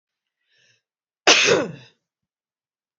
{
  "cough_length": "3.0 s",
  "cough_amplitude": 31407,
  "cough_signal_mean_std_ratio": 0.29,
  "survey_phase": "beta (2021-08-13 to 2022-03-07)",
  "age": "45-64",
  "gender": "Female",
  "wearing_mask": "No",
  "symptom_runny_or_blocked_nose": true,
  "symptom_other": true,
  "smoker_status": "Never smoked",
  "respiratory_condition_asthma": false,
  "respiratory_condition_other": false,
  "recruitment_source": "REACT",
  "submission_delay": "1 day",
  "covid_test_result": "Negative",
  "covid_test_method": "RT-qPCR"
}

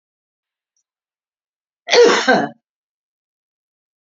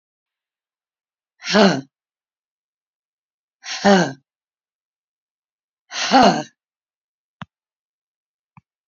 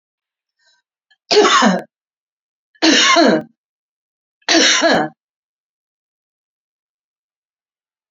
{
  "cough_length": "4.0 s",
  "cough_amplitude": 32768,
  "cough_signal_mean_std_ratio": 0.29,
  "exhalation_length": "8.9 s",
  "exhalation_amplitude": 30598,
  "exhalation_signal_mean_std_ratio": 0.26,
  "three_cough_length": "8.1 s",
  "three_cough_amplitude": 32768,
  "three_cough_signal_mean_std_ratio": 0.38,
  "survey_phase": "alpha (2021-03-01 to 2021-08-12)",
  "age": "65+",
  "gender": "Female",
  "wearing_mask": "No",
  "symptom_none": true,
  "smoker_status": "Never smoked",
  "respiratory_condition_asthma": true,
  "respiratory_condition_other": false,
  "recruitment_source": "REACT",
  "submission_delay": "1 day",
  "covid_test_result": "Negative",
  "covid_test_method": "RT-qPCR"
}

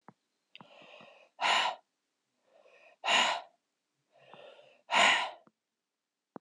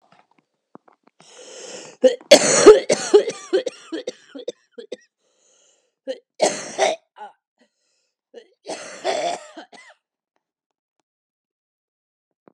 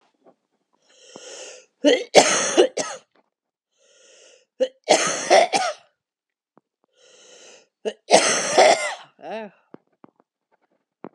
{
  "exhalation_length": "6.4 s",
  "exhalation_amplitude": 8086,
  "exhalation_signal_mean_std_ratio": 0.34,
  "cough_length": "12.5 s",
  "cough_amplitude": 32768,
  "cough_signal_mean_std_ratio": 0.27,
  "three_cough_length": "11.1 s",
  "three_cough_amplitude": 32768,
  "three_cough_signal_mean_std_ratio": 0.35,
  "survey_phase": "alpha (2021-03-01 to 2021-08-12)",
  "age": "18-44",
  "gender": "Female",
  "wearing_mask": "No",
  "symptom_cough_any": true,
  "symptom_shortness_of_breath": true,
  "symptom_abdominal_pain": true,
  "symptom_diarrhoea": true,
  "symptom_fatigue": true,
  "symptom_fever_high_temperature": true,
  "symptom_headache": true,
  "symptom_onset": "3 days",
  "smoker_status": "Never smoked",
  "respiratory_condition_asthma": true,
  "respiratory_condition_other": false,
  "recruitment_source": "Test and Trace",
  "submission_delay": "2 days",
  "covid_test_result": "Positive",
  "covid_test_method": "RT-qPCR"
}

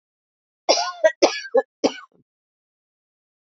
{
  "cough_length": "3.4 s",
  "cough_amplitude": 28535,
  "cough_signal_mean_std_ratio": 0.31,
  "survey_phase": "alpha (2021-03-01 to 2021-08-12)",
  "age": "45-64",
  "gender": "Female",
  "wearing_mask": "Yes",
  "symptom_cough_any": true,
  "symptom_fatigue": true,
  "symptom_fever_high_temperature": true,
  "symptom_headache": true,
  "symptom_loss_of_taste": true,
  "symptom_onset": "8 days",
  "smoker_status": "Never smoked",
  "respiratory_condition_asthma": false,
  "respiratory_condition_other": false,
  "recruitment_source": "Test and Trace",
  "submission_delay": "2 days",
  "covid_test_result": "Positive",
  "covid_test_method": "RT-qPCR"
}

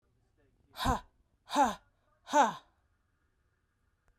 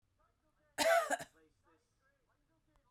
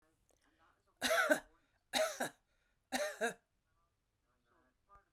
{
  "exhalation_length": "4.2 s",
  "exhalation_amplitude": 7400,
  "exhalation_signal_mean_std_ratio": 0.3,
  "cough_length": "2.9 s",
  "cough_amplitude": 3635,
  "cough_signal_mean_std_ratio": 0.29,
  "three_cough_length": "5.1 s",
  "three_cough_amplitude": 3917,
  "three_cough_signal_mean_std_ratio": 0.35,
  "survey_phase": "beta (2021-08-13 to 2022-03-07)",
  "age": "45-64",
  "gender": "Female",
  "wearing_mask": "No",
  "symptom_none": true,
  "smoker_status": "Never smoked",
  "respiratory_condition_asthma": false,
  "respiratory_condition_other": false,
  "recruitment_source": "REACT",
  "submission_delay": "1 day",
  "covid_test_result": "Negative",
  "covid_test_method": "RT-qPCR",
  "influenza_a_test_result": "Negative",
  "influenza_b_test_result": "Negative"
}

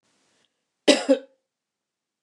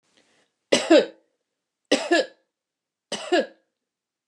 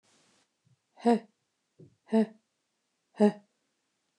{
  "cough_length": "2.2 s",
  "cough_amplitude": 27383,
  "cough_signal_mean_std_ratio": 0.23,
  "three_cough_length": "4.3 s",
  "three_cough_amplitude": 22769,
  "three_cough_signal_mean_std_ratio": 0.31,
  "exhalation_length": "4.2 s",
  "exhalation_amplitude": 8871,
  "exhalation_signal_mean_std_ratio": 0.24,
  "survey_phase": "beta (2021-08-13 to 2022-03-07)",
  "age": "45-64",
  "gender": "Female",
  "wearing_mask": "No",
  "symptom_none": true,
  "smoker_status": "Never smoked",
  "respiratory_condition_asthma": false,
  "respiratory_condition_other": false,
  "recruitment_source": "REACT",
  "submission_delay": "2 days",
  "covid_test_result": "Negative",
  "covid_test_method": "RT-qPCR",
  "influenza_a_test_result": "Negative",
  "influenza_b_test_result": "Negative"
}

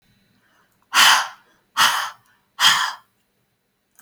{
  "exhalation_length": "4.0 s",
  "exhalation_amplitude": 30543,
  "exhalation_signal_mean_std_ratio": 0.37,
  "survey_phase": "alpha (2021-03-01 to 2021-08-12)",
  "age": "45-64",
  "gender": "Female",
  "wearing_mask": "No",
  "symptom_none": true,
  "smoker_status": "Never smoked",
  "respiratory_condition_asthma": false,
  "respiratory_condition_other": false,
  "recruitment_source": "REACT",
  "submission_delay": "1 day",
  "covid_test_result": "Negative",
  "covid_test_method": "RT-qPCR"
}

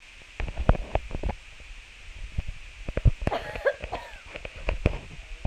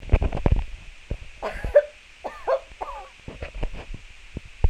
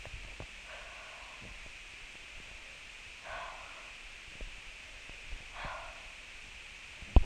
{
  "cough_length": "5.5 s",
  "cough_amplitude": 22846,
  "cough_signal_mean_std_ratio": 0.5,
  "three_cough_length": "4.7 s",
  "three_cough_amplitude": 26428,
  "three_cough_signal_mean_std_ratio": 0.46,
  "exhalation_length": "7.3 s",
  "exhalation_amplitude": 14038,
  "exhalation_signal_mean_std_ratio": 0.36,
  "survey_phase": "beta (2021-08-13 to 2022-03-07)",
  "age": "18-44",
  "gender": "Female",
  "wearing_mask": "No",
  "symptom_none": true,
  "smoker_status": "Ex-smoker",
  "respiratory_condition_asthma": true,
  "respiratory_condition_other": false,
  "recruitment_source": "REACT",
  "submission_delay": "1 day",
  "covid_test_result": "Negative",
  "covid_test_method": "RT-qPCR",
  "influenza_a_test_result": "Negative",
  "influenza_b_test_result": "Negative"
}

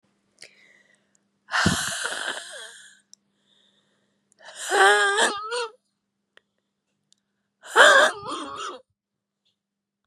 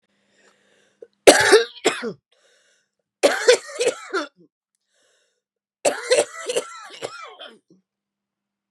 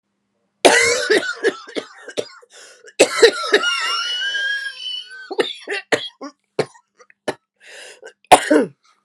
{
  "exhalation_length": "10.1 s",
  "exhalation_amplitude": 31805,
  "exhalation_signal_mean_std_ratio": 0.35,
  "three_cough_length": "8.7 s",
  "three_cough_amplitude": 32768,
  "three_cough_signal_mean_std_ratio": 0.32,
  "cough_length": "9.0 s",
  "cough_amplitude": 32768,
  "cough_signal_mean_std_ratio": 0.45,
  "survey_phase": "beta (2021-08-13 to 2022-03-07)",
  "age": "18-44",
  "gender": "Female",
  "wearing_mask": "No",
  "symptom_cough_any": true,
  "symptom_shortness_of_breath": true,
  "symptom_fatigue": true,
  "symptom_headache": true,
  "symptom_change_to_sense_of_smell_or_taste": true,
  "symptom_loss_of_taste": true,
  "symptom_other": true,
  "symptom_onset": "3 days",
  "smoker_status": "Ex-smoker",
  "respiratory_condition_asthma": true,
  "respiratory_condition_other": false,
  "recruitment_source": "Test and Trace",
  "submission_delay": "1 day",
  "covid_test_result": "Positive",
  "covid_test_method": "ePCR"
}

